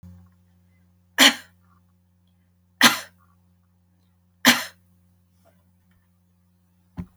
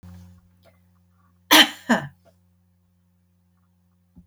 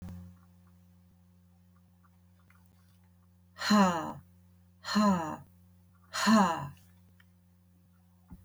{
  "three_cough_length": "7.2 s",
  "three_cough_amplitude": 32563,
  "three_cough_signal_mean_std_ratio": 0.2,
  "cough_length": "4.3 s",
  "cough_amplitude": 32768,
  "cough_signal_mean_std_ratio": 0.21,
  "exhalation_length": "8.4 s",
  "exhalation_amplitude": 7356,
  "exhalation_signal_mean_std_ratio": 0.36,
  "survey_phase": "alpha (2021-03-01 to 2021-08-12)",
  "age": "65+",
  "gender": "Female",
  "wearing_mask": "No",
  "symptom_headache": true,
  "smoker_status": "Never smoked",
  "respiratory_condition_asthma": false,
  "respiratory_condition_other": false,
  "recruitment_source": "REACT",
  "submission_delay": "2 days",
  "covid_test_result": "Negative",
  "covid_test_method": "RT-qPCR"
}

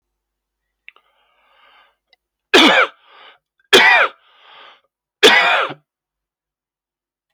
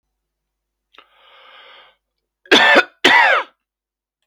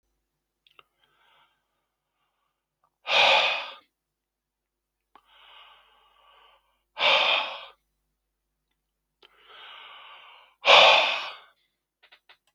{
  "three_cough_length": "7.3 s",
  "three_cough_amplitude": 32767,
  "three_cough_signal_mean_std_ratio": 0.32,
  "cough_length": "4.3 s",
  "cough_amplitude": 32691,
  "cough_signal_mean_std_ratio": 0.34,
  "exhalation_length": "12.5 s",
  "exhalation_amplitude": 25830,
  "exhalation_signal_mean_std_ratio": 0.28,
  "survey_phase": "beta (2021-08-13 to 2022-03-07)",
  "age": "45-64",
  "gender": "Male",
  "wearing_mask": "No",
  "symptom_cough_any": true,
  "symptom_runny_or_blocked_nose": true,
  "symptom_sore_throat": true,
  "smoker_status": "Ex-smoker",
  "respiratory_condition_asthma": false,
  "respiratory_condition_other": false,
  "recruitment_source": "Test and Trace",
  "submission_delay": "1 day",
  "covid_test_result": "Positive",
  "covid_test_method": "RT-qPCR"
}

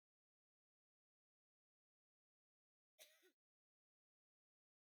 {
  "cough_length": "4.9 s",
  "cough_amplitude": 106,
  "cough_signal_mean_std_ratio": 0.16,
  "survey_phase": "beta (2021-08-13 to 2022-03-07)",
  "age": "45-64",
  "gender": "Female",
  "wearing_mask": "No",
  "symptom_none": true,
  "smoker_status": "Never smoked",
  "respiratory_condition_asthma": false,
  "respiratory_condition_other": false,
  "recruitment_source": "REACT",
  "submission_delay": "1 day",
  "covid_test_result": "Negative",
  "covid_test_method": "RT-qPCR"
}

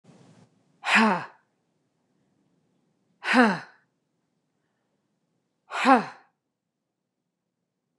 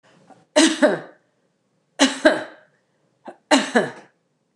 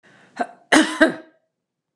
{
  "exhalation_length": "8.0 s",
  "exhalation_amplitude": 22787,
  "exhalation_signal_mean_std_ratio": 0.26,
  "three_cough_length": "4.6 s",
  "three_cough_amplitude": 29203,
  "three_cough_signal_mean_std_ratio": 0.35,
  "cough_length": "2.0 s",
  "cough_amplitude": 29203,
  "cough_signal_mean_std_ratio": 0.34,
  "survey_phase": "beta (2021-08-13 to 2022-03-07)",
  "age": "65+",
  "gender": "Female",
  "wearing_mask": "No",
  "symptom_none": true,
  "smoker_status": "Ex-smoker",
  "respiratory_condition_asthma": false,
  "respiratory_condition_other": false,
  "recruitment_source": "REACT",
  "submission_delay": "2 days",
  "covid_test_result": "Negative",
  "covid_test_method": "RT-qPCR",
  "influenza_a_test_result": "Negative",
  "influenza_b_test_result": "Negative"
}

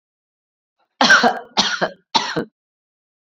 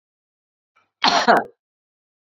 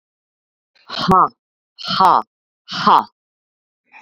{
  "three_cough_length": "3.2 s",
  "three_cough_amplitude": 30293,
  "three_cough_signal_mean_std_ratio": 0.38,
  "cough_length": "2.3 s",
  "cough_amplitude": 27710,
  "cough_signal_mean_std_ratio": 0.31,
  "exhalation_length": "4.0 s",
  "exhalation_amplitude": 29260,
  "exhalation_signal_mean_std_ratio": 0.35,
  "survey_phase": "beta (2021-08-13 to 2022-03-07)",
  "age": "45-64",
  "gender": "Female",
  "wearing_mask": "No",
  "symptom_none": true,
  "smoker_status": "Never smoked",
  "respiratory_condition_asthma": false,
  "respiratory_condition_other": false,
  "recruitment_source": "REACT",
  "submission_delay": "3 days",
  "covid_test_result": "Negative",
  "covid_test_method": "RT-qPCR"
}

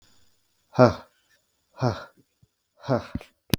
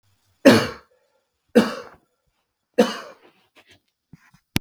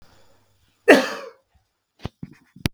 {
  "exhalation_length": "3.6 s",
  "exhalation_amplitude": 32766,
  "exhalation_signal_mean_std_ratio": 0.25,
  "three_cough_length": "4.6 s",
  "three_cough_amplitude": 32768,
  "three_cough_signal_mean_std_ratio": 0.25,
  "cough_length": "2.7 s",
  "cough_amplitude": 32768,
  "cough_signal_mean_std_ratio": 0.23,
  "survey_phase": "beta (2021-08-13 to 2022-03-07)",
  "age": "45-64",
  "gender": "Male",
  "wearing_mask": "No",
  "symptom_runny_or_blocked_nose": true,
  "symptom_shortness_of_breath": true,
  "symptom_fatigue": true,
  "symptom_headache": true,
  "symptom_change_to_sense_of_smell_or_taste": true,
  "symptom_onset": "3 days",
  "smoker_status": "Ex-smoker",
  "respiratory_condition_asthma": false,
  "respiratory_condition_other": false,
  "recruitment_source": "Test and Trace",
  "submission_delay": "2 days",
  "covid_test_result": "Positive",
  "covid_test_method": "RT-qPCR",
  "covid_ct_value": 20.5,
  "covid_ct_gene": "ORF1ab gene",
  "covid_ct_mean": 21.3,
  "covid_viral_load": "100000 copies/ml",
  "covid_viral_load_category": "Low viral load (10K-1M copies/ml)"
}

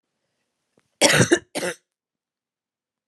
{
  "cough_length": "3.1 s",
  "cough_amplitude": 32181,
  "cough_signal_mean_std_ratio": 0.29,
  "survey_phase": "beta (2021-08-13 to 2022-03-07)",
  "age": "18-44",
  "gender": "Female",
  "wearing_mask": "No",
  "symptom_runny_or_blocked_nose": true,
  "symptom_fatigue": true,
  "symptom_headache": true,
  "symptom_change_to_sense_of_smell_or_taste": true,
  "symptom_loss_of_taste": true,
  "symptom_onset": "6 days",
  "smoker_status": "Ex-smoker",
  "respiratory_condition_asthma": false,
  "respiratory_condition_other": false,
  "recruitment_source": "Test and Trace",
  "submission_delay": "2 days",
  "covid_test_result": "Positive",
  "covid_test_method": "RT-qPCR",
  "covid_ct_value": 19.8,
  "covid_ct_gene": "ORF1ab gene"
}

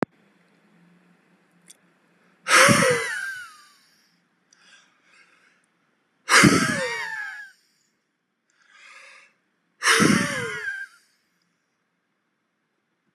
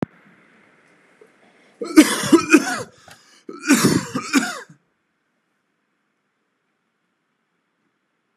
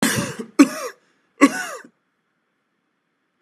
{
  "exhalation_length": "13.1 s",
  "exhalation_amplitude": 28874,
  "exhalation_signal_mean_std_ratio": 0.33,
  "cough_length": "8.4 s",
  "cough_amplitude": 32768,
  "cough_signal_mean_std_ratio": 0.29,
  "three_cough_length": "3.4 s",
  "three_cough_amplitude": 32767,
  "three_cough_signal_mean_std_ratio": 0.3,
  "survey_phase": "beta (2021-08-13 to 2022-03-07)",
  "age": "18-44",
  "gender": "Male",
  "wearing_mask": "No",
  "symptom_fatigue": true,
  "smoker_status": "Never smoked",
  "respiratory_condition_asthma": false,
  "respiratory_condition_other": false,
  "recruitment_source": "REACT",
  "submission_delay": "5 days",
  "covid_test_result": "Negative",
  "covid_test_method": "RT-qPCR",
  "influenza_a_test_result": "Unknown/Void",
  "influenza_b_test_result": "Unknown/Void"
}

